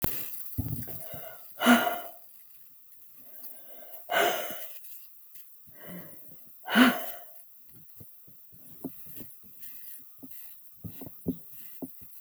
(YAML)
exhalation_length: 12.2 s
exhalation_amplitude: 17016
exhalation_signal_mean_std_ratio: 0.46
survey_phase: beta (2021-08-13 to 2022-03-07)
age: 45-64
gender: Female
wearing_mask: 'No'
symptom_none: true
smoker_status: Ex-smoker
respiratory_condition_asthma: false
respiratory_condition_other: false
recruitment_source: REACT
submission_delay: 1 day
covid_test_result: Negative
covid_test_method: RT-qPCR
influenza_a_test_result: Negative
influenza_b_test_result: Negative